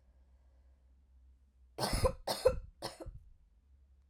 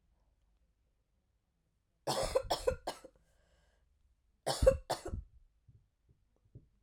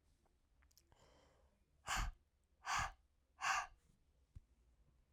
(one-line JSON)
{"three_cough_length": "4.1 s", "three_cough_amplitude": 5430, "three_cough_signal_mean_std_ratio": 0.34, "cough_length": "6.8 s", "cough_amplitude": 7759, "cough_signal_mean_std_ratio": 0.28, "exhalation_length": "5.1 s", "exhalation_amplitude": 1485, "exhalation_signal_mean_std_ratio": 0.35, "survey_phase": "alpha (2021-03-01 to 2021-08-12)", "age": "18-44", "gender": "Female", "wearing_mask": "No", "symptom_cough_any": true, "symptom_shortness_of_breath": true, "symptom_fatigue": true, "symptom_onset": "5 days", "smoker_status": "Never smoked", "respiratory_condition_asthma": false, "respiratory_condition_other": false, "recruitment_source": "Test and Trace", "submission_delay": "2 days", "covid_test_result": "Positive", "covid_test_method": "RT-qPCR", "covid_ct_value": 11.5, "covid_ct_gene": "ORF1ab gene", "covid_ct_mean": 12.0, "covid_viral_load": "120000000 copies/ml", "covid_viral_load_category": "High viral load (>1M copies/ml)"}